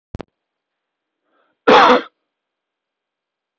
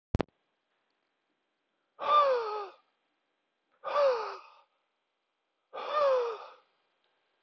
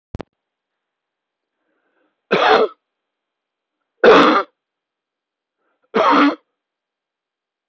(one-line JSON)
{"cough_length": "3.6 s", "cough_amplitude": 29308, "cough_signal_mean_std_ratio": 0.25, "exhalation_length": "7.4 s", "exhalation_amplitude": 9224, "exhalation_signal_mean_std_ratio": 0.39, "three_cough_length": "7.7 s", "three_cough_amplitude": 29522, "three_cough_signal_mean_std_ratio": 0.31, "survey_phase": "beta (2021-08-13 to 2022-03-07)", "age": "45-64", "gender": "Male", "wearing_mask": "No", "symptom_runny_or_blocked_nose": true, "symptom_fatigue": true, "symptom_other": true, "symptom_onset": "3 days", "smoker_status": "Ex-smoker", "respiratory_condition_asthma": false, "respiratory_condition_other": false, "recruitment_source": "REACT", "submission_delay": "0 days", "covid_test_result": "Negative", "covid_test_method": "RT-qPCR"}